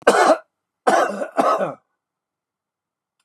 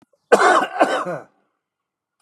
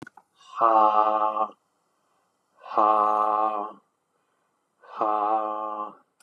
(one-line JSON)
{"three_cough_length": "3.2 s", "three_cough_amplitude": 32765, "three_cough_signal_mean_std_ratio": 0.43, "cough_length": "2.2 s", "cough_amplitude": 32547, "cough_signal_mean_std_ratio": 0.43, "exhalation_length": "6.2 s", "exhalation_amplitude": 17056, "exhalation_signal_mean_std_ratio": 0.51, "survey_phase": "beta (2021-08-13 to 2022-03-07)", "age": "45-64", "gender": "Male", "wearing_mask": "No", "symptom_cough_any": true, "smoker_status": "Current smoker (11 or more cigarettes per day)", "respiratory_condition_asthma": false, "respiratory_condition_other": false, "recruitment_source": "REACT", "submission_delay": "1 day", "covid_test_result": "Negative", "covid_test_method": "RT-qPCR", "influenza_a_test_result": "Negative", "influenza_b_test_result": "Negative"}